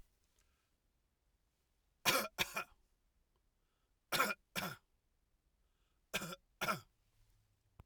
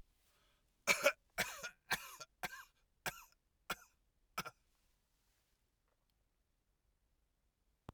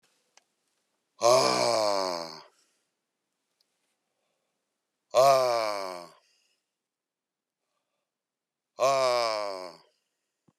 {"three_cough_length": "7.9 s", "three_cough_amplitude": 5667, "three_cough_signal_mean_std_ratio": 0.29, "cough_length": "7.9 s", "cough_amplitude": 5306, "cough_signal_mean_std_ratio": 0.23, "exhalation_length": "10.6 s", "exhalation_amplitude": 11050, "exhalation_signal_mean_std_ratio": 0.37, "survey_phase": "alpha (2021-03-01 to 2021-08-12)", "age": "65+", "gender": "Male", "wearing_mask": "No", "symptom_none": true, "smoker_status": "Never smoked", "respiratory_condition_asthma": false, "respiratory_condition_other": false, "recruitment_source": "REACT", "submission_delay": "2 days", "covid_test_result": "Negative", "covid_test_method": "RT-qPCR"}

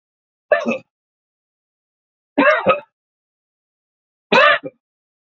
{"three_cough_length": "5.4 s", "three_cough_amplitude": 28633, "three_cough_signal_mean_std_ratio": 0.31, "survey_phase": "beta (2021-08-13 to 2022-03-07)", "age": "65+", "gender": "Male", "wearing_mask": "No", "symptom_runny_or_blocked_nose": true, "symptom_fatigue": true, "smoker_status": "Ex-smoker", "respiratory_condition_asthma": true, "respiratory_condition_other": false, "recruitment_source": "Test and Trace", "submission_delay": "0 days", "covid_test_result": "Negative", "covid_test_method": "LFT"}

